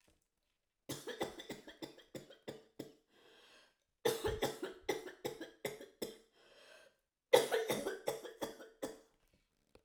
{"three_cough_length": "9.8 s", "three_cough_amplitude": 8799, "three_cough_signal_mean_std_ratio": 0.37, "survey_phase": "alpha (2021-03-01 to 2021-08-12)", "age": "65+", "gender": "Female", "wearing_mask": "No", "symptom_none": true, "smoker_status": "Never smoked", "respiratory_condition_asthma": true, "respiratory_condition_other": false, "recruitment_source": "REACT", "submission_delay": "1 day", "covid_test_result": "Negative", "covid_test_method": "RT-qPCR"}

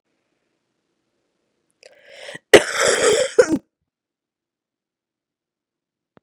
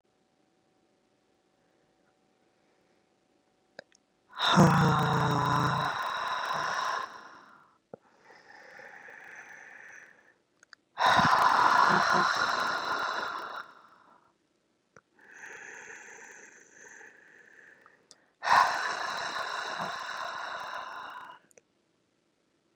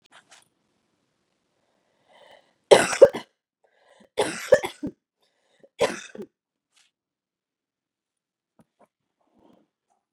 {"cough_length": "6.2 s", "cough_amplitude": 32768, "cough_signal_mean_std_ratio": 0.25, "exhalation_length": "22.8 s", "exhalation_amplitude": 12562, "exhalation_signal_mean_std_ratio": 0.44, "three_cough_length": "10.1 s", "three_cough_amplitude": 31918, "three_cough_signal_mean_std_ratio": 0.17, "survey_phase": "beta (2021-08-13 to 2022-03-07)", "age": "18-44", "gender": "Female", "wearing_mask": "No", "symptom_cough_any": true, "symptom_new_continuous_cough": true, "symptom_runny_or_blocked_nose": true, "symptom_sore_throat": true, "symptom_onset": "4 days", "smoker_status": "Never smoked", "respiratory_condition_asthma": false, "respiratory_condition_other": false, "recruitment_source": "Test and Trace", "submission_delay": "2 days", "covid_test_result": "Positive", "covid_test_method": "RT-qPCR", "covid_ct_value": 19.0, "covid_ct_gene": "N gene", "covid_ct_mean": 19.8, "covid_viral_load": "330000 copies/ml", "covid_viral_load_category": "Low viral load (10K-1M copies/ml)"}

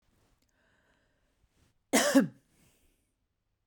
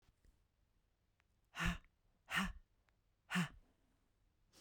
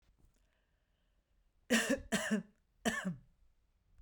{"cough_length": "3.7 s", "cough_amplitude": 9923, "cough_signal_mean_std_ratio": 0.24, "exhalation_length": "4.6 s", "exhalation_amplitude": 1864, "exhalation_signal_mean_std_ratio": 0.31, "three_cough_length": "4.0 s", "three_cough_amplitude": 5037, "three_cough_signal_mean_std_ratio": 0.37, "survey_phase": "beta (2021-08-13 to 2022-03-07)", "age": "45-64", "gender": "Female", "wearing_mask": "No", "symptom_none": true, "smoker_status": "Ex-smoker", "respiratory_condition_asthma": false, "respiratory_condition_other": false, "recruitment_source": "REACT", "submission_delay": "3 days", "covid_test_result": "Negative", "covid_test_method": "RT-qPCR"}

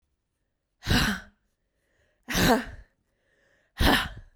{"exhalation_length": "4.4 s", "exhalation_amplitude": 14326, "exhalation_signal_mean_std_ratio": 0.38, "survey_phase": "beta (2021-08-13 to 2022-03-07)", "age": "18-44", "gender": "Female", "wearing_mask": "No", "symptom_cough_any": true, "symptom_shortness_of_breath": true, "symptom_sore_throat": true, "symptom_fatigue": true, "symptom_headache": true, "smoker_status": "Current smoker (1 to 10 cigarettes per day)", "respiratory_condition_asthma": false, "respiratory_condition_other": false, "recruitment_source": "Test and Trace", "submission_delay": "1 day", "covid_test_result": "Positive", "covid_test_method": "RT-qPCR", "covid_ct_value": 22.1, "covid_ct_gene": "ORF1ab gene", "covid_ct_mean": 22.6, "covid_viral_load": "38000 copies/ml", "covid_viral_load_category": "Low viral load (10K-1M copies/ml)"}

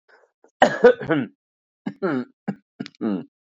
{"cough_length": "3.5 s", "cough_amplitude": 29533, "cough_signal_mean_std_ratio": 0.35, "survey_phase": "beta (2021-08-13 to 2022-03-07)", "age": "45-64", "gender": "Female", "wearing_mask": "No", "symptom_runny_or_blocked_nose": true, "smoker_status": "Ex-smoker", "respiratory_condition_asthma": false, "respiratory_condition_other": false, "recruitment_source": "Test and Trace", "submission_delay": "3 days", "covid_test_result": "Positive", "covid_test_method": "ePCR"}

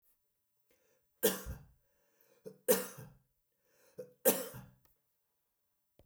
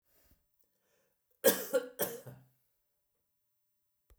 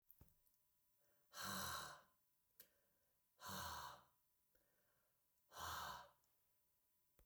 {"three_cough_length": "6.1 s", "three_cough_amplitude": 8402, "three_cough_signal_mean_std_ratio": 0.25, "cough_length": "4.2 s", "cough_amplitude": 9672, "cough_signal_mean_std_ratio": 0.24, "exhalation_length": "7.3 s", "exhalation_amplitude": 547, "exhalation_signal_mean_std_ratio": 0.45, "survey_phase": "beta (2021-08-13 to 2022-03-07)", "age": "65+", "gender": "Male", "wearing_mask": "No", "symptom_none": true, "smoker_status": "Never smoked", "respiratory_condition_asthma": false, "respiratory_condition_other": false, "recruitment_source": "REACT", "submission_delay": "2 days", "covid_test_result": "Negative", "covid_test_method": "RT-qPCR", "influenza_a_test_result": "Negative", "influenza_b_test_result": "Negative"}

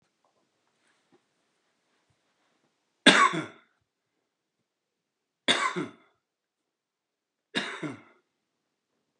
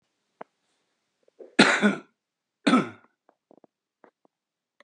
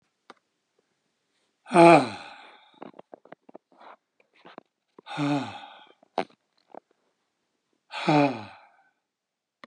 {"three_cough_length": "9.2 s", "three_cough_amplitude": 25683, "three_cough_signal_mean_std_ratio": 0.21, "cough_length": "4.8 s", "cough_amplitude": 25372, "cough_signal_mean_std_ratio": 0.26, "exhalation_length": "9.7 s", "exhalation_amplitude": 25428, "exhalation_signal_mean_std_ratio": 0.23, "survey_phase": "beta (2021-08-13 to 2022-03-07)", "age": "65+", "gender": "Male", "wearing_mask": "No", "symptom_none": true, "smoker_status": "Ex-smoker", "respiratory_condition_asthma": true, "respiratory_condition_other": false, "recruitment_source": "REACT", "submission_delay": "2 days", "covid_test_result": "Negative", "covid_test_method": "RT-qPCR", "influenza_a_test_result": "Negative", "influenza_b_test_result": "Negative"}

